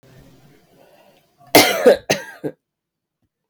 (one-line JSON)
{"cough_length": "3.5 s", "cough_amplitude": 32768, "cough_signal_mean_std_ratio": 0.29, "survey_phase": "beta (2021-08-13 to 2022-03-07)", "age": "18-44", "gender": "Female", "wearing_mask": "No", "symptom_runny_or_blocked_nose": true, "symptom_shortness_of_breath": true, "symptom_fatigue": true, "symptom_headache": true, "symptom_onset": "2 days", "smoker_status": "Never smoked", "respiratory_condition_asthma": true, "respiratory_condition_other": false, "recruitment_source": "Test and Trace", "submission_delay": "1 day", "covid_test_result": "Positive", "covid_test_method": "RT-qPCR", "covid_ct_value": 15.8, "covid_ct_gene": "ORF1ab gene", "covid_ct_mean": 16.0, "covid_viral_load": "5700000 copies/ml", "covid_viral_load_category": "High viral load (>1M copies/ml)"}